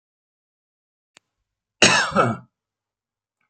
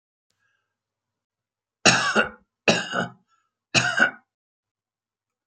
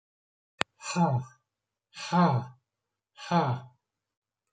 cough_length: 3.5 s
cough_amplitude: 32768
cough_signal_mean_std_ratio: 0.28
three_cough_length: 5.5 s
three_cough_amplitude: 28883
three_cough_signal_mean_std_ratio: 0.32
exhalation_length: 4.5 s
exhalation_amplitude: 27171
exhalation_signal_mean_std_ratio: 0.38
survey_phase: beta (2021-08-13 to 2022-03-07)
age: 65+
gender: Male
wearing_mask: 'No'
symptom_none: true
smoker_status: Ex-smoker
respiratory_condition_asthma: false
respiratory_condition_other: false
recruitment_source: REACT
submission_delay: 1 day
covid_test_result: Negative
covid_test_method: RT-qPCR
influenza_a_test_result: Negative
influenza_b_test_result: Negative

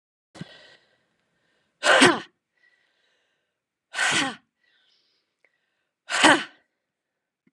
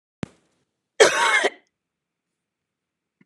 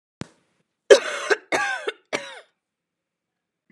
exhalation_length: 7.5 s
exhalation_amplitude: 27354
exhalation_signal_mean_std_ratio: 0.27
cough_length: 3.3 s
cough_amplitude: 31636
cough_signal_mean_std_ratio: 0.29
three_cough_length: 3.7 s
three_cough_amplitude: 32768
three_cough_signal_mean_std_ratio: 0.27
survey_phase: alpha (2021-03-01 to 2021-08-12)
age: 45-64
gender: Female
wearing_mask: 'No'
symptom_none: true
smoker_status: Never smoked
respiratory_condition_asthma: false
respiratory_condition_other: false
recruitment_source: REACT
submission_delay: 1 day
covid_test_result: Negative
covid_test_method: RT-qPCR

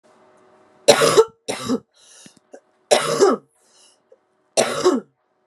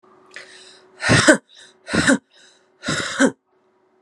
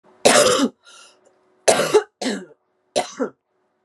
three_cough_length: 5.5 s
three_cough_amplitude: 32768
three_cough_signal_mean_std_ratio: 0.38
exhalation_length: 4.0 s
exhalation_amplitude: 32767
exhalation_signal_mean_std_ratio: 0.38
cough_length: 3.8 s
cough_amplitude: 32422
cough_signal_mean_std_ratio: 0.42
survey_phase: beta (2021-08-13 to 2022-03-07)
age: 18-44
gender: Female
wearing_mask: 'No'
symptom_cough_any: true
symptom_onset: 13 days
smoker_status: Never smoked
respiratory_condition_asthma: false
respiratory_condition_other: false
recruitment_source: REACT
submission_delay: 0 days
covid_test_result: Negative
covid_test_method: RT-qPCR
influenza_a_test_result: Negative
influenza_b_test_result: Negative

